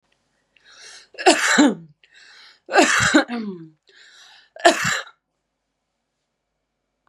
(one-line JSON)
{"three_cough_length": "7.1 s", "three_cough_amplitude": 32767, "three_cough_signal_mean_std_ratio": 0.36, "survey_phase": "beta (2021-08-13 to 2022-03-07)", "age": "18-44", "gender": "Female", "wearing_mask": "No", "symptom_none": true, "symptom_onset": "8 days", "smoker_status": "Never smoked", "respiratory_condition_asthma": false, "respiratory_condition_other": false, "recruitment_source": "REACT", "submission_delay": "3 days", "covid_test_result": "Negative", "covid_test_method": "RT-qPCR", "influenza_a_test_result": "Negative", "influenza_b_test_result": "Negative"}